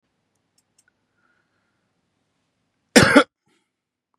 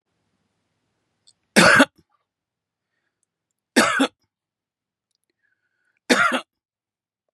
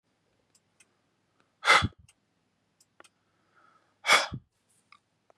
{"cough_length": "4.2 s", "cough_amplitude": 32767, "cough_signal_mean_std_ratio": 0.19, "three_cough_length": "7.3 s", "three_cough_amplitude": 32744, "three_cough_signal_mean_std_ratio": 0.26, "exhalation_length": "5.4 s", "exhalation_amplitude": 15905, "exhalation_signal_mean_std_ratio": 0.22, "survey_phase": "beta (2021-08-13 to 2022-03-07)", "age": "45-64", "gender": "Male", "wearing_mask": "Yes", "symptom_runny_or_blocked_nose": true, "symptom_abdominal_pain": true, "symptom_fatigue": true, "symptom_onset": "10 days", "smoker_status": "Never smoked", "respiratory_condition_asthma": true, "respiratory_condition_other": false, "recruitment_source": "REACT", "submission_delay": "1 day", "covid_test_result": "Negative", "covid_test_method": "RT-qPCR", "influenza_a_test_result": "Unknown/Void", "influenza_b_test_result": "Unknown/Void"}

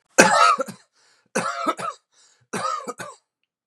{"three_cough_length": "3.7 s", "three_cough_amplitude": 32768, "three_cough_signal_mean_std_ratio": 0.41, "survey_phase": "beta (2021-08-13 to 2022-03-07)", "age": "45-64", "gender": "Male", "wearing_mask": "No", "symptom_cough_any": true, "symptom_runny_or_blocked_nose": true, "smoker_status": "Never smoked", "respiratory_condition_asthma": false, "respiratory_condition_other": false, "recruitment_source": "REACT", "submission_delay": "14 days", "covid_test_result": "Negative", "covid_test_method": "RT-qPCR", "influenza_a_test_result": "Negative", "influenza_b_test_result": "Negative"}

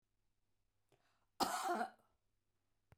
{"cough_length": "3.0 s", "cough_amplitude": 2372, "cough_signal_mean_std_ratio": 0.33, "survey_phase": "beta (2021-08-13 to 2022-03-07)", "age": "65+", "gender": "Female", "wearing_mask": "No", "symptom_none": true, "smoker_status": "Ex-smoker", "respiratory_condition_asthma": true, "respiratory_condition_other": false, "recruitment_source": "REACT", "submission_delay": "1 day", "covid_test_result": "Negative", "covid_test_method": "RT-qPCR", "influenza_a_test_result": "Negative", "influenza_b_test_result": "Negative"}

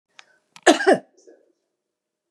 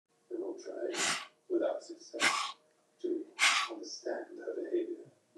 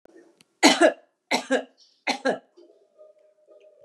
{"cough_length": "2.3 s", "cough_amplitude": 29602, "cough_signal_mean_std_ratio": 0.25, "exhalation_length": "5.4 s", "exhalation_amplitude": 6644, "exhalation_signal_mean_std_ratio": 0.62, "three_cough_length": "3.8 s", "three_cough_amplitude": 26519, "three_cough_signal_mean_std_ratio": 0.32, "survey_phase": "beta (2021-08-13 to 2022-03-07)", "age": "65+", "gender": "Female", "wearing_mask": "No", "symptom_none": true, "smoker_status": "Never smoked", "respiratory_condition_asthma": false, "respiratory_condition_other": false, "recruitment_source": "REACT", "submission_delay": "1 day", "covid_test_result": "Negative", "covid_test_method": "RT-qPCR", "influenza_a_test_result": "Unknown/Void", "influenza_b_test_result": "Unknown/Void"}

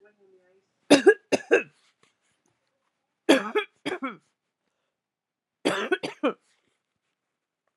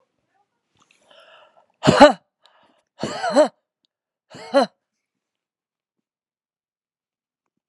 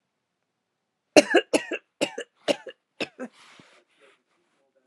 {"three_cough_length": "7.8 s", "three_cough_amplitude": 25017, "three_cough_signal_mean_std_ratio": 0.26, "exhalation_length": "7.7 s", "exhalation_amplitude": 32768, "exhalation_signal_mean_std_ratio": 0.22, "cough_length": "4.9 s", "cough_amplitude": 32767, "cough_signal_mean_std_ratio": 0.22, "survey_phase": "beta (2021-08-13 to 2022-03-07)", "age": "45-64", "gender": "Female", "wearing_mask": "No", "symptom_none": true, "symptom_onset": "11 days", "smoker_status": "Never smoked", "respiratory_condition_asthma": true, "respiratory_condition_other": false, "recruitment_source": "REACT", "submission_delay": "1 day", "covid_test_result": "Negative", "covid_test_method": "RT-qPCR", "influenza_a_test_result": "Negative", "influenza_b_test_result": "Negative"}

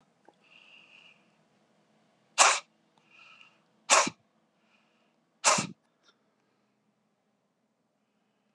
{"exhalation_length": "8.5 s", "exhalation_amplitude": 20753, "exhalation_signal_mean_std_ratio": 0.21, "survey_phase": "beta (2021-08-13 to 2022-03-07)", "age": "65+", "gender": "Male", "wearing_mask": "No", "symptom_cough_any": true, "symptom_runny_or_blocked_nose": true, "symptom_fatigue": true, "symptom_headache": true, "symptom_onset": "3 days", "smoker_status": "Ex-smoker", "respiratory_condition_asthma": false, "respiratory_condition_other": false, "recruitment_source": "Test and Trace", "submission_delay": "2 days", "covid_test_result": "Positive", "covid_test_method": "RT-qPCR", "covid_ct_value": 12.1, "covid_ct_gene": "ORF1ab gene", "covid_ct_mean": 12.6, "covid_viral_load": "75000000 copies/ml", "covid_viral_load_category": "High viral load (>1M copies/ml)"}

